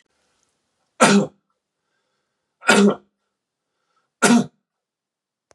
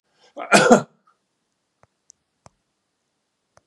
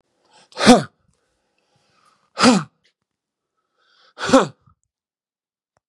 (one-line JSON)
{"three_cough_length": "5.5 s", "three_cough_amplitude": 32767, "three_cough_signal_mean_std_ratio": 0.29, "cough_length": "3.7 s", "cough_amplitude": 32767, "cough_signal_mean_std_ratio": 0.22, "exhalation_length": "5.9 s", "exhalation_amplitude": 32767, "exhalation_signal_mean_std_ratio": 0.25, "survey_phase": "beta (2021-08-13 to 2022-03-07)", "age": "45-64", "gender": "Male", "wearing_mask": "No", "symptom_none": true, "smoker_status": "Never smoked", "respiratory_condition_asthma": false, "respiratory_condition_other": false, "recruitment_source": "REACT", "submission_delay": "1 day", "covid_test_result": "Negative", "covid_test_method": "RT-qPCR", "influenza_a_test_result": "Negative", "influenza_b_test_result": "Negative"}